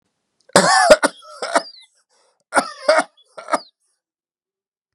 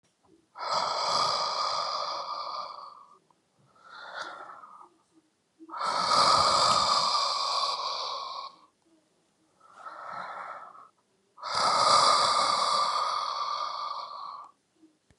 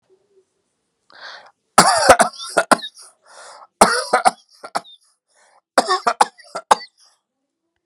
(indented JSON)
{
  "cough_length": "4.9 s",
  "cough_amplitude": 32768,
  "cough_signal_mean_std_ratio": 0.34,
  "exhalation_length": "15.2 s",
  "exhalation_amplitude": 11433,
  "exhalation_signal_mean_std_ratio": 0.63,
  "three_cough_length": "7.9 s",
  "three_cough_amplitude": 32768,
  "three_cough_signal_mean_std_ratio": 0.31,
  "survey_phase": "beta (2021-08-13 to 2022-03-07)",
  "age": "45-64",
  "gender": "Male",
  "wearing_mask": "No",
  "symptom_none": true,
  "smoker_status": "Never smoked",
  "respiratory_condition_asthma": false,
  "respiratory_condition_other": false,
  "recruitment_source": "REACT",
  "submission_delay": "2 days",
  "covid_test_result": "Negative",
  "covid_test_method": "RT-qPCR"
}